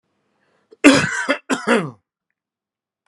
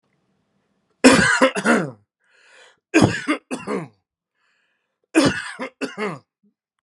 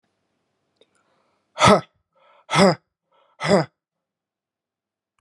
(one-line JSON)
{"cough_length": "3.1 s", "cough_amplitude": 32767, "cough_signal_mean_std_ratio": 0.35, "three_cough_length": "6.8 s", "three_cough_amplitude": 32768, "three_cough_signal_mean_std_ratio": 0.38, "exhalation_length": "5.2 s", "exhalation_amplitude": 31242, "exhalation_signal_mean_std_ratio": 0.26, "survey_phase": "beta (2021-08-13 to 2022-03-07)", "age": "65+", "gender": "Male", "wearing_mask": "No", "symptom_none": true, "smoker_status": "Ex-smoker", "respiratory_condition_asthma": false, "respiratory_condition_other": false, "recruitment_source": "REACT", "submission_delay": "1 day", "covid_test_result": "Negative", "covid_test_method": "RT-qPCR"}